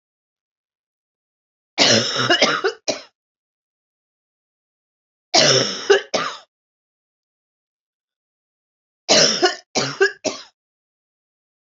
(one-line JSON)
{"three_cough_length": "11.8 s", "three_cough_amplitude": 32768, "three_cough_signal_mean_std_ratio": 0.35, "survey_phase": "beta (2021-08-13 to 2022-03-07)", "age": "45-64", "gender": "Female", "wearing_mask": "No", "symptom_runny_or_blocked_nose": true, "smoker_status": "Never smoked", "respiratory_condition_asthma": false, "respiratory_condition_other": false, "recruitment_source": "Test and Trace", "submission_delay": "2 days", "covid_test_result": "Positive", "covid_test_method": "RT-qPCR", "covid_ct_value": 21.1, "covid_ct_gene": "ORF1ab gene", "covid_ct_mean": 21.7, "covid_viral_load": "78000 copies/ml", "covid_viral_load_category": "Low viral load (10K-1M copies/ml)"}